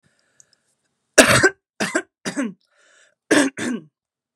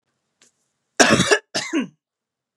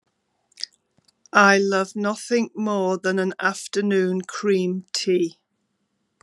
{"three_cough_length": "4.4 s", "three_cough_amplitude": 32768, "three_cough_signal_mean_std_ratio": 0.34, "cough_length": "2.6 s", "cough_amplitude": 32767, "cough_signal_mean_std_ratio": 0.36, "exhalation_length": "6.2 s", "exhalation_amplitude": 31356, "exhalation_signal_mean_std_ratio": 0.59, "survey_phase": "beta (2021-08-13 to 2022-03-07)", "age": "45-64", "gender": "Female", "wearing_mask": "No", "symptom_cough_any": true, "symptom_shortness_of_breath": true, "symptom_fatigue": true, "symptom_loss_of_taste": true, "symptom_onset": "3 days", "smoker_status": "Ex-smoker", "respiratory_condition_asthma": false, "respiratory_condition_other": false, "recruitment_source": "Test and Trace", "submission_delay": "2 days", "covid_test_result": "Positive", "covid_test_method": "RT-qPCR"}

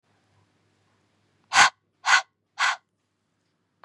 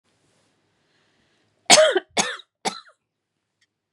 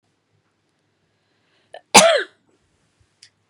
{"exhalation_length": "3.8 s", "exhalation_amplitude": 26176, "exhalation_signal_mean_std_ratio": 0.26, "three_cough_length": "3.9 s", "three_cough_amplitude": 32768, "three_cough_signal_mean_std_ratio": 0.26, "cough_length": "3.5 s", "cough_amplitude": 32768, "cough_signal_mean_std_ratio": 0.22, "survey_phase": "beta (2021-08-13 to 2022-03-07)", "age": "18-44", "gender": "Female", "wearing_mask": "No", "symptom_sore_throat": true, "symptom_onset": "13 days", "smoker_status": "Ex-smoker", "respiratory_condition_asthma": false, "respiratory_condition_other": false, "recruitment_source": "REACT", "submission_delay": "2 days", "covid_test_result": "Negative", "covid_test_method": "RT-qPCR", "influenza_a_test_result": "Negative", "influenza_b_test_result": "Negative"}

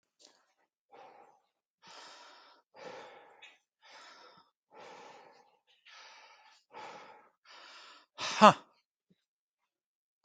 {"exhalation_length": "10.2 s", "exhalation_amplitude": 18502, "exhalation_signal_mean_std_ratio": 0.14, "survey_phase": "beta (2021-08-13 to 2022-03-07)", "age": "45-64", "gender": "Male", "wearing_mask": "No", "symptom_none": true, "smoker_status": "Never smoked", "respiratory_condition_asthma": false, "respiratory_condition_other": false, "recruitment_source": "REACT", "submission_delay": "2 days", "covid_test_result": "Negative", "covid_test_method": "RT-qPCR"}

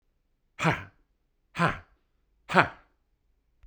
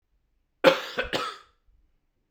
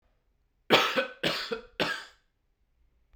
{"exhalation_length": "3.7 s", "exhalation_amplitude": 30386, "exhalation_signal_mean_std_ratio": 0.27, "cough_length": "2.3 s", "cough_amplitude": 29119, "cough_signal_mean_std_ratio": 0.29, "three_cough_length": "3.2 s", "three_cough_amplitude": 20651, "three_cough_signal_mean_std_ratio": 0.38, "survey_phase": "beta (2021-08-13 to 2022-03-07)", "age": "45-64", "gender": "Male", "wearing_mask": "No", "symptom_cough_any": true, "symptom_runny_or_blocked_nose": true, "symptom_fatigue": true, "symptom_headache": true, "symptom_other": true, "symptom_onset": "4 days", "smoker_status": "Ex-smoker", "respiratory_condition_asthma": false, "respiratory_condition_other": false, "recruitment_source": "Test and Trace", "submission_delay": "2 days", "covid_test_result": "Positive", "covid_test_method": "RT-qPCR"}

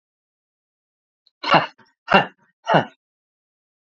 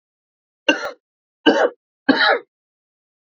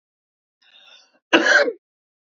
{"exhalation_length": "3.8 s", "exhalation_amplitude": 28298, "exhalation_signal_mean_std_ratio": 0.26, "three_cough_length": "3.2 s", "three_cough_amplitude": 28712, "three_cough_signal_mean_std_ratio": 0.36, "cough_length": "2.3 s", "cough_amplitude": 27871, "cough_signal_mean_std_ratio": 0.32, "survey_phase": "beta (2021-08-13 to 2022-03-07)", "age": "45-64", "gender": "Male", "wearing_mask": "No", "symptom_cough_any": true, "symptom_new_continuous_cough": true, "symptom_fatigue": true, "symptom_onset": "5 days", "smoker_status": "Never smoked", "respiratory_condition_asthma": true, "respiratory_condition_other": false, "recruitment_source": "Test and Trace", "submission_delay": "2 days", "covid_test_result": "Positive", "covid_test_method": "RT-qPCR", "covid_ct_value": 18.6, "covid_ct_gene": "ORF1ab gene", "covid_ct_mean": 19.1, "covid_viral_load": "560000 copies/ml", "covid_viral_load_category": "Low viral load (10K-1M copies/ml)"}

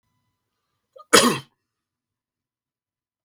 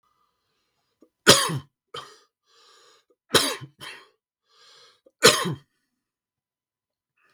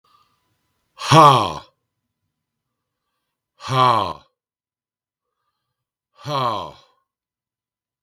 {"cough_length": "3.2 s", "cough_amplitude": 32768, "cough_signal_mean_std_ratio": 0.2, "three_cough_length": "7.3 s", "three_cough_amplitude": 32768, "three_cough_signal_mean_std_ratio": 0.23, "exhalation_length": "8.0 s", "exhalation_amplitude": 32768, "exhalation_signal_mean_std_ratio": 0.28, "survey_phase": "beta (2021-08-13 to 2022-03-07)", "age": "45-64", "gender": "Male", "wearing_mask": "No", "symptom_cough_any": true, "symptom_runny_or_blocked_nose": true, "symptom_onset": "3 days", "smoker_status": "Never smoked", "respiratory_condition_asthma": false, "respiratory_condition_other": false, "recruitment_source": "Test and Trace", "submission_delay": "2 days", "covid_test_result": "Positive", "covid_test_method": "RT-qPCR", "covid_ct_value": 13.2, "covid_ct_gene": "S gene"}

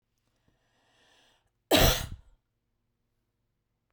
{"cough_length": "3.9 s", "cough_amplitude": 13529, "cough_signal_mean_std_ratio": 0.23, "survey_phase": "beta (2021-08-13 to 2022-03-07)", "age": "45-64", "gender": "Female", "wearing_mask": "No", "symptom_cough_any": true, "symptom_sore_throat": true, "symptom_fatigue": true, "smoker_status": "Never smoked", "respiratory_condition_asthma": false, "respiratory_condition_other": false, "recruitment_source": "REACT", "submission_delay": "1 day", "covid_test_result": "Negative", "covid_test_method": "RT-qPCR"}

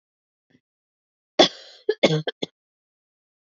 {"cough_length": "3.5 s", "cough_amplitude": 26756, "cough_signal_mean_std_ratio": 0.23, "survey_phase": "alpha (2021-03-01 to 2021-08-12)", "age": "18-44", "gender": "Female", "wearing_mask": "No", "symptom_cough_any": true, "symptom_fatigue": true, "symptom_fever_high_temperature": true, "smoker_status": "Never smoked", "respiratory_condition_asthma": false, "respiratory_condition_other": false, "recruitment_source": "Test and Trace", "submission_delay": "2 days", "covid_test_result": "Positive", "covid_test_method": "RT-qPCR"}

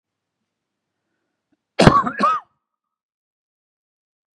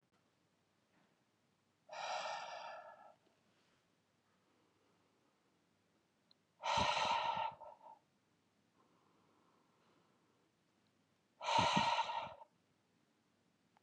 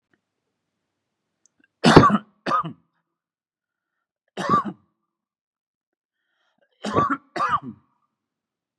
{"cough_length": "4.4 s", "cough_amplitude": 32768, "cough_signal_mean_std_ratio": 0.25, "exhalation_length": "13.8 s", "exhalation_amplitude": 3331, "exhalation_signal_mean_std_ratio": 0.35, "three_cough_length": "8.8 s", "three_cough_amplitude": 32768, "three_cough_signal_mean_std_ratio": 0.27, "survey_phase": "beta (2021-08-13 to 2022-03-07)", "age": "45-64", "gender": "Male", "wearing_mask": "No", "symptom_none": true, "smoker_status": "Never smoked", "respiratory_condition_asthma": false, "respiratory_condition_other": false, "recruitment_source": "REACT", "submission_delay": "1 day", "covid_test_result": "Negative", "covid_test_method": "RT-qPCR", "influenza_a_test_result": "Negative", "influenza_b_test_result": "Negative"}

